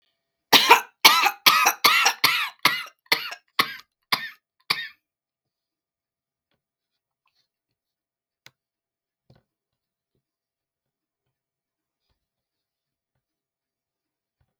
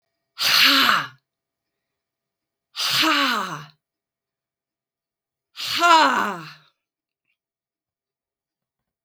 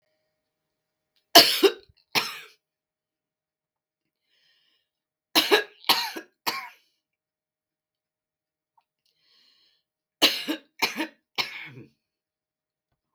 {"cough_length": "14.6 s", "cough_amplitude": 32768, "cough_signal_mean_std_ratio": 0.25, "exhalation_length": "9.0 s", "exhalation_amplitude": 27142, "exhalation_signal_mean_std_ratio": 0.38, "three_cough_length": "13.1 s", "three_cough_amplitude": 32768, "three_cough_signal_mean_std_ratio": 0.23, "survey_phase": "beta (2021-08-13 to 2022-03-07)", "age": "65+", "gender": "Female", "wearing_mask": "No", "symptom_cough_any": true, "symptom_new_continuous_cough": true, "symptom_runny_or_blocked_nose": true, "symptom_onset": "4 days", "smoker_status": "Ex-smoker", "respiratory_condition_asthma": true, "respiratory_condition_other": false, "recruitment_source": "Test and Trace", "submission_delay": "2 days", "covid_test_result": "Positive", "covid_test_method": "LAMP"}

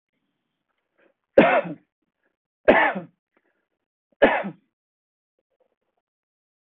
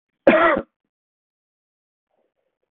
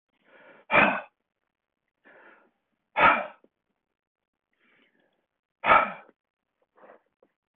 {"three_cough_length": "6.7 s", "three_cough_amplitude": 25802, "three_cough_signal_mean_std_ratio": 0.25, "cough_length": "2.7 s", "cough_amplitude": 25562, "cough_signal_mean_std_ratio": 0.27, "exhalation_length": "7.6 s", "exhalation_amplitude": 17555, "exhalation_signal_mean_std_ratio": 0.25, "survey_phase": "beta (2021-08-13 to 2022-03-07)", "age": "45-64", "gender": "Male", "wearing_mask": "No", "symptom_none": true, "smoker_status": "Never smoked", "respiratory_condition_asthma": false, "respiratory_condition_other": false, "recruitment_source": "REACT", "submission_delay": "2 days", "covid_test_result": "Negative", "covid_test_method": "RT-qPCR"}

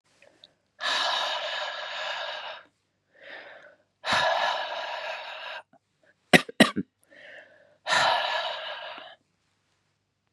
{"exhalation_length": "10.3 s", "exhalation_amplitude": 28471, "exhalation_signal_mean_std_ratio": 0.44, "survey_phase": "beta (2021-08-13 to 2022-03-07)", "age": "18-44", "gender": "Female", "wearing_mask": "No", "symptom_cough_any": true, "symptom_runny_or_blocked_nose": true, "symptom_sore_throat": true, "symptom_change_to_sense_of_smell_or_taste": true, "symptom_onset": "4 days", "smoker_status": "Never smoked", "respiratory_condition_asthma": false, "respiratory_condition_other": false, "recruitment_source": "Test and Trace", "submission_delay": "1 day", "covid_test_result": "Positive", "covid_test_method": "ePCR"}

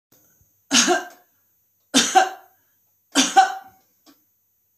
{"three_cough_length": "4.8 s", "three_cough_amplitude": 28367, "three_cough_signal_mean_std_ratio": 0.35, "survey_phase": "beta (2021-08-13 to 2022-03-07)", "age": "65+", "gender": "Female", "wearing_mask": "No", "symptom_none": true, "smoker_status": "Never smoked", "respiratory_condition_asthma": false, "respiratory_condition_other": false, "recruitment_source": "REACT", "submission_delay": "4 days", "covid_test_result": "Negative", "covid_test_method": "RT-qPCR"}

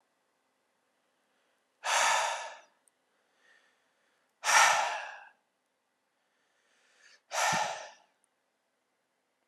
{"exhalation_length": "9.5 s", "exhalation_amplitude": 11470, "exhalation_signal_mean_std_ratio": 0.32, "survey_phase": "alpha (2021-03-01 to 2021-08-12)", "age": "18-44", "gender": "Male", "wearing_mask": "No", "symptom_none": true, "smoker_status": "Ex-smoker", "respiratory_condition_asthma": false, "respiratory_condition_other": false, "recruitment_source": "REACT", "submission_delay": "2 days", "covid_test_result": "Negative", "covid_test_method": "RT-qPCR", "covid_ct_value": 40.0, "covid_ct_gene": "N gene"}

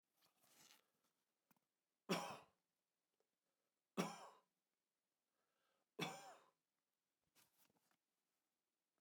{"three_cough_length": "9.0 s", "three_cough_amplitude": 1244, "three_cough_signal_mean_std_ratio": 0.22, "survey_phase": "alpha (2021-03-01 to 2021-08-12)", "age": "65+", "gender": "Male", "wearing_mask": "No", "symptom_none": true, "smoker_status": "Ex-smoker", "respiratory_condition_asthma": false, "respiratory_condition_other": false, "recruitment_source": "REACT", "submission_delay": "2 days", "covid_test_result": "Negative", "covid_test_method": "RT-qPCR"}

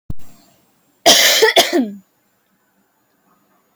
{"cough_length": "3.8 s", "cough_amplitude": 32767, "cough_signal_mean_std_ratio": 0.41, "survey_phase": "alpha (2021-03-01 to 2021-08-12)", "age": "18-44", "gender": "Female", "wearing_mask": "No", "symptom_cough_any": true, "symptom_fever_high_temperature": true, "symptom_onset": "3 days", "smoker_status": "Never smoked", "respiratory_condition_asthma": false, "respiratory_condition_other": false, "recruitment_source": "Test and Trace", "submission_delay": "2 days", "covid_test_result": "Positive", "covid_test_method": "RT-qPCR", "covid_ct_value": 23.9, "covid_ct_gene": "ORF1ab gene"}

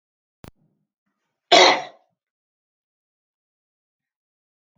{"cough_length": "4.8 s", "cough_amplitude": 29322, "cough_signal_mean_std_ratio": 0.19, "survey_phase": "alpha (2021-03-01 to 2021-08-12)", "age": "65+", "gender": "Female", "wearing_mask": "No", "symptom_none": true, "smoker_status": "Never smoked", "respiratory_condition_asthma": false, "respiratory_condition_other": false, "recruitment_source": "REACT", "submission_delay": "2 days", "covid_test_result": "Negative", "covid_test_method": "RT-qPCR"}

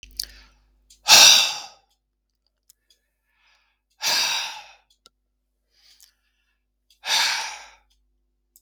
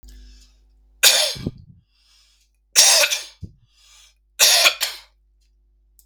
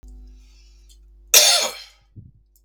{"exhalation_length": "8.6 s", "exhalation_amplitude": 32768, "exhalation_signal_mean_std_ratio": 0.27, "three_cough_length": "6.1 s", "three_cough_amplitude": 32768, "three_cough_signal_mean_std_ratio": 0.36, "cough_length": "2.6 s", "cough_amplitude": 32768, "cough_signal_mean_std_ratio": 0.32, "survey_phase": "beta (2021-08-13 to 2022-03-07)", "age": "45-64", "gender": "Male", "wearing_mask": "No", "symptom_runny_or_blocked_nose": true, "symptom_headache": true, "smoker_status": "Never smoked", "respiratory_condition_asthma": false, "respiratory_condition_other": false, "recruitment_source": "Test and Trace", "submission_delay": "2 days", "covid_test_result": "Positive", "covid_test_method": "RT-qPCR"}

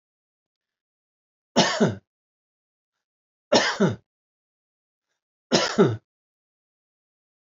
{"three_cough_length": "7.5 s", "three_cough_amplitude": 21841, "three_cough_signal_mean_std_ratio": 0.29, "survey_phase": "alpha (2021-03-01 to 2021-08-12)", "age": "45-64", "gender": "Male", "wearing_mask": "No", "symptom_none": true, "smoker_status": "Never smoked", "respiratory_condition_asthma": false, "respiratory_condition_other": false, "recruitment_source": "REACT", "submission_delay": "1 day", "covid_test_result": "Negative", "covid_test_method": "RT-qPCR"}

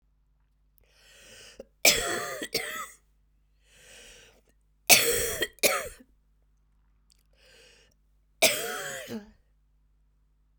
{"three_cough_length": "10.6 s", "three_cough_amplitude": 30679, "three_cough_signal_mean_std_ratio": 0.31, "survey_phase": "beta (2021-08-13 to 2022-03-07)", "age": "45-64", "gender": "Female", "wearing_mask": "No", "symptom_cough_any": true, "symptom_runny_or_blocked_nose": true, "symptom_shortness_of_breath": true, "symptom_sore_throat": true, "symptom_fatigue": true, "symptom_fever_high_temperature": true, "symptom_headache": true, "smoker_status": "Never smoked", "respiratory_condition_asthma": false, "respiratory_condition_other": false, "recruitment_source": "Test and Trace", "submission_delay": "2 days", "covid_test_result": "Positive", "covid_test_method": "RT-qPCR", "covid_ct_value": 15.7, "covid_ct_gene": "ORF1ab gene", "covid_ct_mean": 16.0, "covid_viral_load": "5500000 copies/ml", "covid_viral_load_category": "High viral load (>1M copies/ml)"}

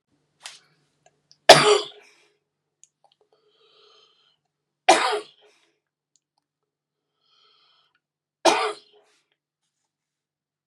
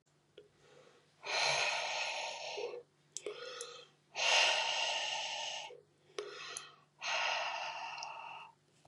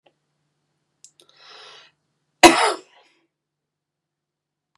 {"three_cough_length": "10.7 s", "three_cough_amplitude": 32768, "three_cough_signal_mean_std_ratio": 0.19, "exhalation_length": "8.9 s", "exhalation_amplitude": 4792, "exhalation_signal_mean_std_ratio": 0.63, "cough_length": "4.8 s", "cough_amplitude": 32768, "cough_signal_mean_std_ratio": 0.17, "survey_phase": "beta (2021-08-13 to 2022-03-07)", "age": "18-44", "gender": "Female", "wearing_mask": "No", "symptom_none": true, "smoker_status": "Never smoked", "respiratory_condition_asthma": false, "respiratory_condition_other": false, "recruitment_source": "REACT", "submission_delay": "3 days", "covid_test_result": "Negative", "covid_test_method": "RT-qPCR", "influenza_a_test_result": "Negative", "influenza_b_test_result": "Negative"}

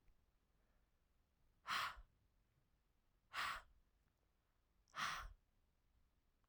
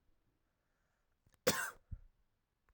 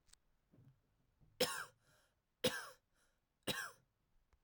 {"exhalation_length": "6.5 s", "exhalation_amplitude": 898, "exhalation_signal_mean_std_ratio": 0.33, "cough_length": "2.7 s", "cough_amplitude": 4901, "cough_signal_mean_std_ratio": 0.23, "three_cough_length": "4.4 s", "three_cough_amplitude": 3214, "three_cough_signal_mean_std_ratio": 0.29, "survey_phase": "alpha (2021-03-01 to 2021-08-12)", "age": "18-44", "gender": "Female", "wearing_mask": "No", "symptom_none": true, "smoker_status": "Never smoked", "respiratory_condition_asthma": false, "respiratory_condition_other": false, "recruitment_source": "Test and Trace", "submission_delay": "1 day", "covid_test_result": "Positive", "covid_test_method": "RT-qPCR", "covid_ct_value": 16.5, "covid_ct_gene": "ORF1ab gene", "covid_ct_mean": 16.9, "covid_viral_load": "2800000 copies/ml", "covid_viral_load_category": "High viral load (>1M copies/ml)"}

